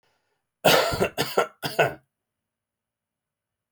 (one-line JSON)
{"three_cough_length": "3.7 s", "three_cough_amplitude": 21078, "three_cough_signal_mean_std_ratio": 0.36, "survey_phase": "beta (2021-08-13 to 2022-03-07)", "age": "45-64", "gender": "Male", "wearing_mask": "No", "symptom_cough_any": true, "symptom_fatigue": true, "symptom_change_to_sense_of_smell_or_taste": true, "symptom_loss_of_taste": true, "smoker_status": "Ex-smoker", "respiratory_condition_asthma": false, "respiratory_condition_other": false, "recruitment_source": "REACT", "submission_delay": "2 days", "covid_test_result": "Negative", "covid_test_method": "RT-qPCR"}